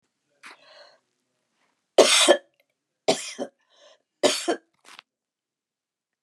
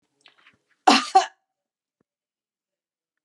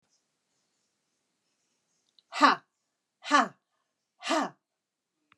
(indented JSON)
{
  "three_cough_length": "6.2 s",
  "three_cough_amplitude": 31122,
  "three_cough_signal_mean_std_ratio": 0.27,
  "cough_length": "3.2 s",
  "cough_amplitude": 26702,
  "cough_signal_mean_std_ratio": 0.21,
  "exhalation_length": "5.4 s",
  "exhalation_amplitude": 15354,
  "exhalation_signal_mean_std_ratio": 0.24,
  "survey_phase": "beta (2021-08-13 to 2022-03-07)",
  "age": "65+",
  "gender": "Female",
  "wearing_mask": "No",
  "symptom_none": true,
  "smoker_status": "Never smoked",
  "respiratory_condition_asthma": false,
  "respiratory_condition_other": false,
  "recruitment_source": "REACT",
  "submission_delay": "1 day",
  "covid_test_result": "Negative",
  "covid_test_method": "RT-qPCR"
}